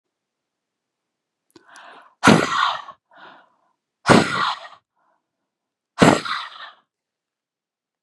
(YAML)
exhalation_length: 8.0 s
exhalation_amplitude: 32768
exhalation_signal_mean_std_ratio: 0.29
survey_phase: beta (2021-08-13 to 2022-03-07)
age: 18-44
gender: Female
wearing_mask: 'No'
symptom_none: true
smoker_status: Never smoked
respiratory_condition_asthma: false
respiratory_condition_other: false
recruitment_source: REACT
submission_delay: 3 days
covid_test_result: Negative
covid_test_method: RT-qPCR
influenza_a_test_result: Negative
influenza_b_test_result: Negative